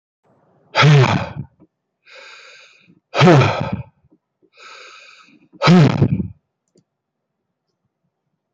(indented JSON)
{
  "exhalation_length": "8.5 s",
  "exhalation_amplitude": 28576,
  "exhalation_signal_mean_std_ratio": 0.35,
  "survey_phase": "beta (2021-08-13 to 2022-03-07)",
  "age": "45-64",
  "gender": "Male",
  "wearing_mask": "No",
  "symptom_cough_any": true,
  "symptom_sore_throat": true,
  "symptom_onset": "2 days",
  "smoker_status": "Never smoked",
  "respiratory_condition_asthma": true,
  "respiratory_condition_other": false,
  "recruitment_source": "REACT",
  "submission_delay": "0 days",
  "covid_test_result": "Negative",
  "covid_test_method": "RT-qPCR",
  "covid_ct_value": 46.0,
  "covid_ct_gene": "N gene"
}